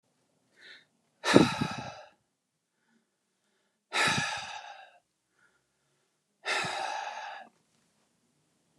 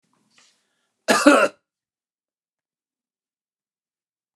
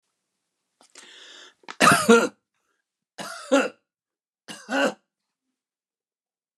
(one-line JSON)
{"exhalation_length": "8.8 s", "exhalation_amplitude": 25486, "exhalation_signal_mean_std_ratio": 0.31, "cough_length": "4.4 s", "cough_amplitude": 32767, "cough_signal_mean_std_ratio": 0.22, "three_cough_length": "6.6 s", "three_cough_amplitude": 27469, "three_cough_signal_mean_std_ratio": 0.28, "survey_phase": "beta (2021-08-13 to 2022-03-07)", "age": "65+", "gender": "Male", "wearing_mask": "No", "symptom_none": true, "smoker_status": "Never smoked", "respiratory_condition_asthma": false, "respiratory_condition_other": false, "recruitment_source": "REACT", "submission_delay": "2 days", "covid_test_result": "Negative", "covid_test_method": "RT-qPCR"}